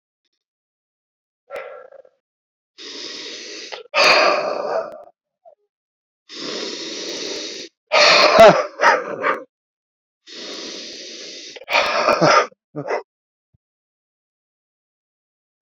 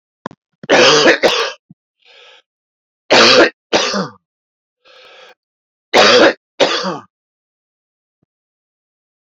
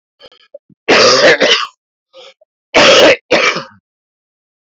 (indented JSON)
{
  "exhalation_length": "15.6 s",
  "exhalation_amplitude": 32128,
  "exhalation_signal_mean_std_ratio": 0.38,
  "three_cough_length": "9.3 s",
  "three_cough_amplitude": 32768,
  "three_cough_signal_mean_std_ratio": 0.4,
  "cough_length": "4.6 s",
  "cough_amplitude": 32768,
  "cough_signal_mean_std_ratio": 0.51,
  "survey_phase": "beta (2021-08-13 to 2022-03-07)",
  "age": "45-64",
  "gender": "Male",
  "wearing_mask": "No",
  "symptom_cough_any": true,
  "symptom_new_continuous_cough": true,
  "symptom_runny_or_blocked_nose": true,
  "symptom_shortness_of_breath": true,
  "symptom_sore_throat": true,
  "symptom_fatigue": true,
  "symptom_headache": true,
  "symptom_change_to_sense_of_smell_or_taste": true,
  "symptom_other": true,
  "symptom_onset": "6 days",
  "smoker_status": "Never smoked",
  "respiratory_condition_asthma": true,
  "respiratory_condition_other": false,
  "recruitment_source": "Test and Trace",
  "submission_delay": "1 day",
  "covid_test_result": "Positive",
  "covid_test_method": "RT-qPCR",
  "covid_ct_value": 20.2,
  "covid_ct_gene": "ORF1ab gene",
  "covid_ct_mean": 21.4,
  "covid_viral_load": "95000 copies/ml",
  "covid_viral_load_category": "Low viral load (10K-1M copies/ml)"
}